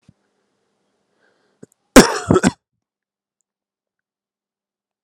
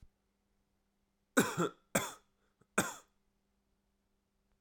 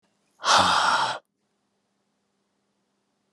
{"cough_length": "5.0 s", "cough_amplitude": 32768, "cough_signal_mean_std_ratio": 0.19, "three_cough_length": "4.6 s", "three_cough_amplitude": 6994, "three_cough_signal_mean_std_ratio": 0.25, "exhalation_length": "3.3 s", "exhalation_amplitude": 17301, "exhalation_signal_mean_std_ratio": 0.38, "survey_phase": "alpha (2021-03-01 to 2021-08-12)", "age": "18-44", "gender": "Male", "wearing_mask": "No", "symptom_cough_any": true, "symptom_fever_high_temperature": true, "symptom_change_to_sense_of_smell_or_taste": true, "symptom_onset": "4 days", "smoker_status": "Never smoked", "respiratory_condition_asthma": false, "respiratory_condition_other": false, "recruitment_source": "Test and Trace", "submission_delay": "2 days", "covid_test_result": "Positive", "covid_test_method": "RT-qPCR", "covid_ct_value": 13.6, "covid_ct_gene": "ORF1ab gene", "covid_ct_mean": 14.3, "covid_viral_load": "21000000 copies/ml", "covid_viral_load_category": "High viral load (>1M copies/ml)"}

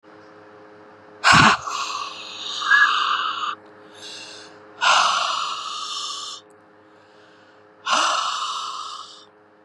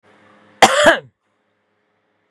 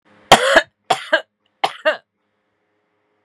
{"exhalation_length": "9.6 s", "exhalation_amplitude": 30050, "exhalation_signal_mean_std_ratio": 0.52, "cough_length": "2.3 s", "cough_amplitude": 32768, "cough_signal_mean_std_ratio": 0.29, "three_cough_length": "3.2 s", "three_cough_amplitude": 32768, "three_cough_signal_mean_std_ratio": 0.31, "survey_phase": "beta (2021-08-13 to 2022-03-07)", "age": "45-64", "gender": "Female", "wearing_mask": "No", "symptom_none": true, "smoker_status": "Current smoker (1 to 10 cigarettes per day)", "respiratory_condition_asthma": false, "respiratory_condition_other": false, "recruitment_source": "REACT", "submission_delay": "1 day", "covid_test_result": "Negative", "covid_test_method": "RT-qPCR", "influenza_a_test_result": "Negative", "influenza_b_test_result": "Negative"}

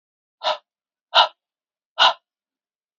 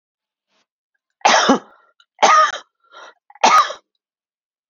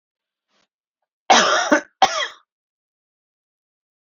{"exhalation_length": "3.0 s", "exhalation_amplitude": 30535, "exhalation_signal_mean_std_ratio": 0.26, "three_cough_length": "4.7 s", "three_cough_amplitude": 30499, "three_cough_signal_mean_std_ratio": 0.37, "cough_length": "4.0 s", "cough_amplitude": 27796, "cough_signal_mean_std_ratio": 0.31, "survey_phase": "beta (2021-08-13 to 2022-03-07)", "age": "45-64", "gender": "Male", "wearing_mask": "No", "symptom_none": true, "smoker_status": "Never smoked", "respiratory_condition_asthma": false, "respiratory_condition_other": true, "recruitment_source": "REACT", "submission_delay": "1 day", "covid_test_result": "Negative", "covid_test_method": "RT-qPCR"}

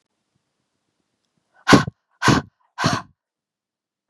{"exhalation_length": "4.1 s", "exhalation_amplitude": 32767, "exhalation_signal_mean_std_ratio": 0.26, "survey_phase": "beta (2021-08-13 to 2022-03-07)", "age": "18-44", "gender": "Female", "wearing_mask": "No", "symptom_cough_any": true, "symptom_new_continuous_cough": true, "symptom_runny_or_blocked_nose": true, "symptom_shortness_of_breath": true, "symptom_diarrhoea": true, "symptom_fatigue": true, "symptom_headache": true, "symptom_onset": "3 days", "smoker_status": "Ex-smoker", "respiratory_condition_asthma": false, "respiratory_condition_other": false, "recruitment_source": "Test and Trace", "submission_delay": "2 days", "covid_test_result": "Positive", "covid_test_method": "RT-qPCR", "covid_ct_value": 21.9, "covid_ct_gene": "ORF1ab gene", "covid_ct_mean": 22.0, "covid_viral_load": "60000 copies/ml", "covid_viral_load_category": "Low viral load (10K-1M copies/ml)"}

